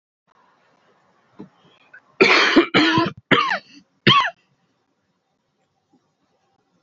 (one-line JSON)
{"cough_length": "6.8 s", "cough_amplitude": 32768, "cough_signal_mean_std_ratio": 0.35, "survey_phase": "beta (2021-08-13 to 2022-03-07)", "age": "18-44", "gender": "Male", "wearing_mask": "No", "symptom_cough_any": true, "symptom_runny_or_blocked_nose": true, "symptom_sore_throat": true, "symptom_headache": true, "symptom_onset": "3 days", "smoker_status": "Never smoked", "respiratory_condition_asthma": true, "respiratory_condition_other": false, "recruitment_source": "REACT", "submission_delay": "1 day", "covid_test_result": "Positive", "covid_test_method": "RT-qPCR", "covid_ct_value": 19.0, "covid_ct_gene": "E gene", "influenza_a_test_result": "Negative", "influenza_b_test_result": "Negative"}